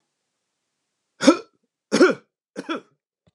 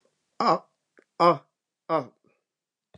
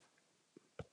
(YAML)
three_cough_length: 3.3 s
three_cough_amplitude: 31145
three_cough_signal_mean_std_ratio: 0.26
exhalation_length: 3.0 s
exhalation_amplitude: 18273
exhalation_signal_mean_std_ratio: 0.29
cough_length: 0.9 s
cough_amplitude: 680
cough_signal_mean_std_ratio: 0.3
survey_phase: alpha (2021-03-01 to 2021-08-12)
age: 45-64
gender: Male
wearing_mask: 'No'
symptom_none: true
smoker_status: Never smoked
respiratory_condition_asthma: false
respiratory_condition_other: false
recruitment_source: REACT
submission_delay: 1 day
covid_test_result: Negative
covid_test_method: RT-qPCR